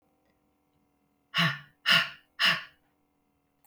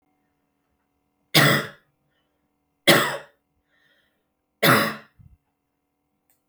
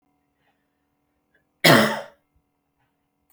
{
  "exhalation_length": "3.7 s",
  "exhalation_amplitude": 12077,
  "exhalation_signal_mean_std_ratio": 0.33,
  "three_cough_length": "6.5 s",
  "three_cough_amplitude": 32120,
  "three_cough_signal_mean_std_ratio": 0.28,
  "cough_length": "3.3 s",
  "cough_amplitude": 29481,
  "cough_signal_mean_std_ratio": 0.24,
  "survey_phase": "beta (2021-08-13 to 2022-03-07)",
  "age": "45-64",
  "gender": "Female",
  "wearing_mask": "No",
  "symptom_headache": true,
  "smoker_status": "Never smoked",
  "respiratory_condition_asthma": false,
  "respiratory_condition_other": false,
  "recruitment_source": "REACT",
  "submission_delay": "1 day",
  "covid_test_result": "Negative",
  "covid_test_method": "RT-qPCR",
  "influenza_a_test_result": "Unknown/Void",
  "influenza_b_test_result": "Unknown/Void"
}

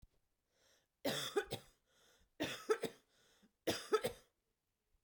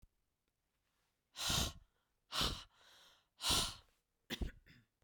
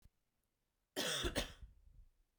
{
  "three_cough_length": "5.0 s",
  "three_cough_amplitude": 2913,
  "three_cough_signal_mean_std_ratio": 0.35,
  "exhalation_length": "5.0 s",
  "exhalation_amplitude": 2529,
  "exhalation_signal_mean_std_ratio": 0.38,
  "cough_length": "2.4 s",
  "cough_amplitude": 2219,
  "cough_signal_mean_std_ratio": 0.42,
  "survey_phase": "beta (2021-08-13 to 2022-03-07)",
  "age": "18-44",
  "gender": "Female",
  "wearing_mask": "No",
  "symptom_runny_or_blocked_nose": true,
  "symptom_sore_throat": true,
  "symptom_fatigue": true,
  "symptom_headache": true,
  "smoker_status": "Never smoked",
  "respiratory_condition_asthma": false,
  "respiratory_condition_other": false,
  "recruitment_source": "Test and Trace",
  "submission_delay": "2 days",
  "covid_test_result": "Positive",
  "covid_test_method": "RT-qPCR"
}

